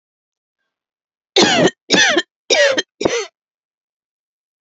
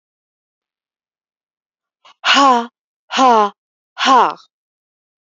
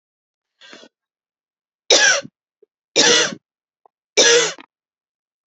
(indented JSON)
{
  "cough_length": "4.6 s",
  "cough_amplitude": 32178,
  "cough_signal_mean_std_ratio": 0.41,
  "exhalation_length": "5.2 s",
  "exhalation_amplitude": 32768,
  "exhalation_signal_mean_std_ratio": 0.35,
  "three_cough_length": "5.5 s",
  "three_cough_amplitude": 32768,
  "three_cough_signal_mean_std_ratio": 0.35,
  "survey_phase": "beta (2021-08-13 to 2022-03-07)",
  "age": "45-64",
  "gender": "Female",
  "wearing_mask": "No",
  "symptom_change_to_sense_of_smell_or_taste": true,
  "symptom_onset": "12 days",
  "smoker_status": "Never smoked",
  "respiratory_condition_asthma": false,
  "respiratory_condition_other": false,
  "recruitment_source": "REACT",
  "submission_delay": "2 days",
  "covid_test_result": "Negative",
  "covid_test_method": "RT-qPCR",
  "influenza_a_test_result": "Negative",
  "influenza_b_test_result": "Negative"
}